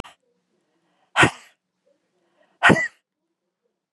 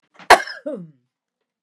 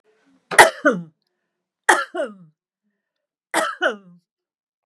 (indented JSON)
{
  "exhalation_length": "3.9 s",
  "exhalation_amplitude": 32762,
  "exhalation_signal_mean_std_ratio": 0.23,
  "cough_length": "1.6 s",
  "cough_amplitude": 32768,
  "cough_signal_mean_std_ratio": 0.23,
  "three_cough_length": "4.9 s",
  "three_cough_amplitude": 32768,
  "three_cough_signal_mean_std_ratio": 0.28,
  "survey_phase": "beta (2021-08-13 to 2022-03-07)",
  "age": "45-64",
  "gender": "Female",
  "wearing_mask": "No",
  "symptom_none": true,
  "smoker_status": "Ex-smoker",
  "respiratory_condition_asthma": false,
  "respiratory_condition_other": false,
  "recruitment_source": "REACT",
  "submission_delay": "1 day",
  "covid_test_result": "Negative",
  "covid_test_method": "RT-qPCR",
  "influenza_a_test_result": "Negative",
  "influenza_b_test_result": "Negative"
}